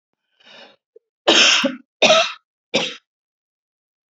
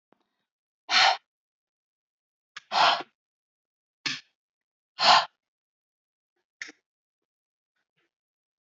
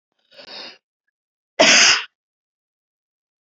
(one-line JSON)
{"three_cough_length": "4.1 s", "three_cough_amplitude": 32491, "three_cough_signal_mean_std_ratio": 0.37, "exhalation_length": "8.6 s", "exhalation_amplitude": 18635, "exhalation_signal_mean_std_ratio": 0.24, "cough_length": "3.4 s", "cough_amplitude": 32767, "cough_signal_mean_std_ratio": 0.29, "survey_phase": "beta (2021-08-13 to 2022-03-07)", "age": "45-64", "gender": "Female", "wearing_mask": "No", "symptom_runny_or_blocked_nose": true, "smoker_status": "Never smoked", "respiratory_condition_asthma": false, "respiratory_condition_other": false, "recruitment_source": "Test and Trace", "submission_delay": "2 days", "covid_test_result": "Positive", "covid_test_method": "LFT"}